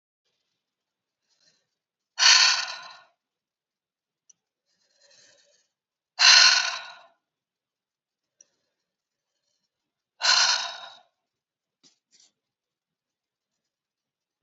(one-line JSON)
{"exhalation_length": "14.4 s", "exhalation_amplitude": 26732, "exhalation_signal_mean_std_ratio": 0.24, "survey_phase": "beta (2021-08-13 to 2022-03-07)", "age": "45-64", "gender": "Female", "wearing_mask": "No", "symptom_runny_or_blocked_nose": true, "symptom_fatigue": true, "symptom_other": true, "symptom_onset": "3 days", "smoker_status": "Current smoker (e-cigarettes or vapes only)", "respiratory_condition_asthma": false, "respiratory_condition_other": false, "recruitment_source": "Test and Trace", "submission_delay": "2 days", "covid_test_result": "Positive", "covid_test_method": "RT-qPCR", "covid_ct_value": 24.9, "covid_ct_gene": "N gene"}